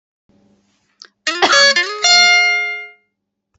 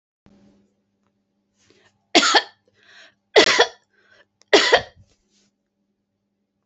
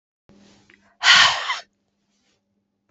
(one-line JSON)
{"cough_length": "3.6 s", "cough_amplitude": 29474, "cough_signal_mean_std_ratio": 0.54, "three_cough_length": "6.7 s", "three_cough_amplitude": 31305, "three_cough_signal_mean_std_ratio": 0.27, "exhalation_length": "2.9 s", "exhalation_amplitude": 28744, "exhalation_signal_mean_std_ratio": 0.31, "survey_phase": "beta (2021-08-13 to 2022-03-07)", "age": "65+", "gender": "Female", "wearing_mask": "No", "symptom_none": true, "smoker_status": "Never smoked", "respiratory_condition_asthma": false, "respiratory_condition_other": false, "recruitment_source": "REACT", "submission_delay": "13 days", "covid_test_result": "Negative", "covid_test_method": "RT-qPCR", "influenza_a_test_result": "Negative", "influenza_b_test_result": "Negative"}